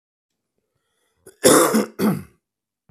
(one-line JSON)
{"cough_length": "2.9 s", "cough_amplitude": 32767, "cough_signal_mean_std_ratio": 0.36, "survey_phase": "beta (2021-08-13 to 2022-03-07)", "age": "45-64", "gender": "Male", "wearing_mask": "No", "symptom_cough_any": true, "symptom_onset": "12 days", "smoker_status": "Ex-smoker", "respiratory_condition_asthma": false, "respiratory_condition_other": false, "recruitment_source": "REACT", "submission_delay": "1 day", "covid_test_result": "Negative", "covid_test_method": "RT-qPCR", "influenza_a_test_result": "Negative", "influenza_b_test_result": "Negative"}